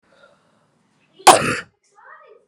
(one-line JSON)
{"cough_length": "2.5 s", "cough_amplitude": 32768, "cough_signal_mean_std_ratio": 0.23, "survey_phase": "beta (2021-08-13 to 2022-03-07)", "age": "18-44", "gender": "Female", "wearing_mask": "No", "symptom_runny_or_blocked_nose": true, "symptom_onset": "4 days", "smoker_status": "Ex-smoker", "respiratory_condition_asthma": false, "respiratory_condition_other": false, "recruitment_source": "REACT", "submission_delay": "0 days", "covid_test_result": "Negative", "covid_test_method": "RT-qPCR"}